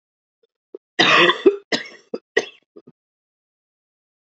{"cough_length": "4.3 s", "cough_amplitude": 28942, "cough_signal_mean_std_ratio": 0.3, "survey_phase": "beta (2021-08-13 to 2022-03-07)", "age": "45-64", "gender": "Female", "wearing_mask": "No", "symptom_new_continuous_cough": true, "symptom_runny_or_blocked_nose": true, "symptom_shortness_of_breath": true, "symptom_sore_throat": true, "symptom_diarrhoea": true, "symptom_fatigue": true, "symptom_fever_high_temperature": true, "symptom_change_to_sense_of_smell_or_taste": true, "smoker_status": "Ex-smoker", "respiratory_condition_asthma": false, "respiratory_condition_other": false, "recruitment_source": "Test and Trace", "submission_delay": "2 days", "covid_test_result": "Positive", "covid_test_method": "LFT"}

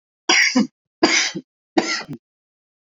{"three_cough_length": "2.9 s", "three_cough_amplitude": 28572, "three_cough_signal_mean_std_ratio": 0.45, "survey_phase": "beta (2021-08-13 to 2022-03-07)", "age": "18-44", "gender": "Male", "wearing_mask": "No", "symptom_none": true, "smoker_status": "Ex-smoker", "respiratory_condition_asthma": true, "respiratory_condition_other": false, "recruitment_source": "REACT", "submission_delay": "2 days", "covid_test_result": "Negative", "covid_test_method": "RT-qPCR"}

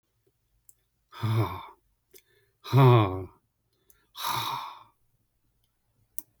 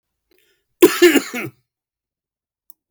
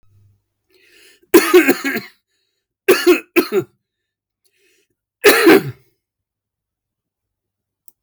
{"exhalation_length": "6.4 s", "exhalation_amplitude": 13124, "exhalation_signal_mean_std_ratio": 0.32, "cough_length": "2.9 s", "cough_amplitude": 32768, "cough_signal_mean_std_ratio": 0.28, "three_cough_length": "8.0 s", "three_cough_amplitude": 32768, "three_cough_signal_mean_std_ratio": 0.32, "survey_phase": "beta (2021-08-13 to 2022-03-07)", "age": "45-64", "gender": "Male", "wearing_mask": "No", "symptom_none": true, "smoker_status": "Never smoked", "respiratory_condition_asthma": false, "respiratory_condition_other": false, "recruitment_source": "REACT", "submission_delay": "2 days", "covid_test_result": "Negative", "covid_test_method": "RT-qPCR", "influenza_a_test_result": "Negative", "influenza_b_test_result": "Negative"}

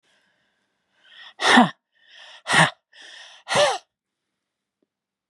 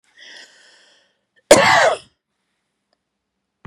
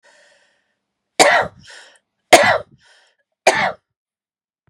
{"exhalation_length": "5.3 s", "exhalation_amplitude": 30767, "exhalation_signal_mean_std_ratio": 0.3, "cough_length": "3.7 s", "cough_amplitude": 32768, "cough_signal_mean_std_ratio": 0.28, "three_cough_length": "4.7 s", "three_cough_amplitude": 32768, "three_cough_signal_mean_std_ratio": 0.3, "survey_phase": "beta (2021-08-13 to 2022-03-07)", "age": "65+", "gender": "Female", "wearing_mask": "No", "symptom_none": true, "smoker_status": "Never smoked", "respiratory_condition_asthma": false, "respiratory_condition_other": false, "recruitment_source": "REACT", "submission_delay": "3 days", "covid_test_result": "Negative", "covid_test_method": "RT-qPCR", "influenza_a_test_result": "Negative", "influenza_b_test_result": "Negative"}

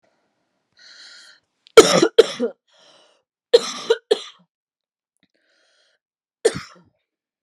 {"three_cough_length": "7.4 s", "three_cough_amplitude": 32768, "three_cough_signal_mean_std_ratio": 0.22, "survey_phase": "beta (2021-08-13 to 2022-03-07)", "age": "18-44", "gender": "Female", "wearing_mask": "No", "symptom_cough_any": true, "symptom_new_continuous_cough": true, "symptom_shortness_of_breath": true, "symptom_sore_throat": true, "symptom_onset": "8 days", "smoker_status": "Never smoked", "respiratory_condition_asthma": false, "respiratory_condition_other": false, "recruitment_source": "REACT", "submission_delay": "7 days", "covid_test_result": "Negative", "covid_test_method": "RT-qPCR"}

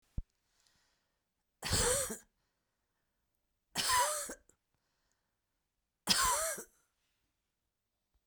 {"three_cough_length": "8.3 s", "three_cough_amplitude": 7528, "three_cough_signal_mean_std_ratio": 0.35, "survey_phase": "beta (2021-08-13 to 2022-03-07)", "age": "45-64", "gender": "Female", "wearing_mask": "No", "symptom_runny_or_blocked_nose": true, "symptom_fatigue": true, "symptom_headache": true, "symptom_change_to_sense_of_smell_or_taste": true, "symptom_loss_of_taste": true, "symptom_onset": "3 days", "smoker_status": "Ex-smoker", "respiratory_condition_asthma": false, "respiratory_condition_other": false, "recruitment_source": "Test and Trace", "submission_delay": "1 day", "covid_test_result": "Positive", "covid_test_method": "RT-qPCR", "covid_ct_value": 21.7, "covid_ct_gene": "ORF1ab gene", "covid_ct_mean": 22.1, "covid_viral_load": "56000 copies/ml", "covid_viral_load_category": "Low viral load (10K-1M copies/ml)"}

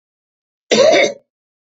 {"cough_length": "1.8 s", "cough_amplitude": 29168, "cough_signal_mean_std_ratio": 0.41, "survey_phase": "beta (2021-08-13 to 2022-03-07)", "age": "45-64", "gender": "Male", "wearing_mask": "No", "symptom_none": true, "symptom_onset": "10 days", "smoker_status": "Never smoked", "respiratory_condition_asthma": false, "respiratory_condition_other": false, "recruitment_source": "REACT", "submission_delay": "0 days", "covid_test_result": "Negative", "covid_test_method": "RT-qPCR", "influenza_a_test_result": "Negative", "influenza_b_test_result": "Negative"}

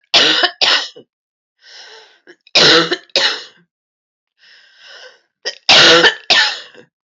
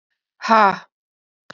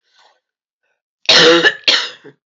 {"three_cough_length": "7.1 s", "three_cough_amplitude": 32767, "three_cough_signal_mean_std_ratio": 0.44, "exhalation_length": "1.5 s", "exhalation_amplitude": 29226, "exhalation_signal_mean_std_ratio": 0.3, "cough_length": "2.6 s", "cough_amplitude": 31055, "cough_signal_mean_std_ratio": 0.42, "survey_phase": "alpha (2021-03-01 to 2021-08-12)", "age": "45-64", "gender": "Female", "wearing_mask": "No", "symptom_cough_any": true, "symptom_shortness_of_breath": true, "symptom_fever_high_temperature": true, "symptom_headache": true, "symptom_onset": "4 days", "smoker_status": "Never smoked", "respiratory_condition_asthma": true, "respiratory_condition_other": false, "recruitment_source": "Test and Trace", "submission_delay": "2 days", "covid_test_result": "Positive", "covid_test_method": "RT-qPCR"}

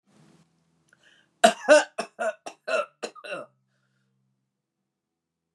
{"cough_length": "5.5 s", "cough_amplitude": 23091, "cough_signal_mean_std_ratio": 0.24, "survey_phase": "alpha (2021-03-01 to 2021-08-12)", "age": "65+", "gender": "Female", "wearing_mask": "No", "symptom_none": true, "smoker_status": "Never smoked", "respiratory_condition_asthma": false, "respiratory_condition_other": false, "recruitment_source": "REACT", "submission_delay": "1 day", "covid_test_result": "Negative", "covid_test_method": "RT-qPCR"}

